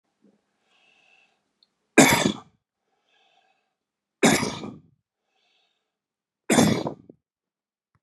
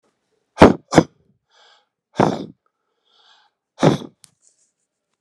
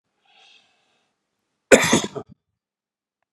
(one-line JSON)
{"three_cough_length": "8.0 s", "three_cough_amplitude": 31698, "three_cough_signal_mean_std_ratio": 0.26, "exhalation_length": "5.2 s", "exhalation_amplitude": 32768, "exhalation_signal_mean_std_ratio": 0.23, "cough_length": "3.3 s", "cough_amplitude": 32768, "cough_signal_mean_std_ratio": 0.22, "survey_phase": "beta (2021-08-13 to 2022-03-07)", "age": "65+", "gender": "Male", "wearing_mask": "No", "symptom_fatigue": true, "symptom_headache": true, "symptom_onset": "5 days", "smoker_status": "Ex-smoker", "respiratory_condition_asthma": false, "respiratory_condition_other": false, "recruitment_source": "Test and Trace", "submission_delay": "2 days", "covid_test_result": "Positive", "covid_test_method": "RT-qPCR", "covid_ct_value": 17.6, "covid_ct_gene": "ORF1ab gene", "covid_ct_mean": 18.4, "covid_viral_load": "910000 copies/ml", "covid_viral_load_category": "Low viral load (10K-1M copies/ml)"}